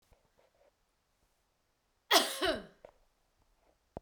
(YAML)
cough_length: 4.0 s
cough_amplitude: 9687
cough_signal_mean_std_ratio: 0.24
survey_phase: beta (2021-08-13 to 2022-03-07)
age: 45-64
gender: Female
wearing_mask: 'No'
symptom_none: true
smoker_status: Never smoked
respiratory_condition_asthma: false
respiratory_condition_other: false
recruitment_source: REACT
submission_delay: 2 days
covid_test_result: Negative
covid_test_method: RT-qPCR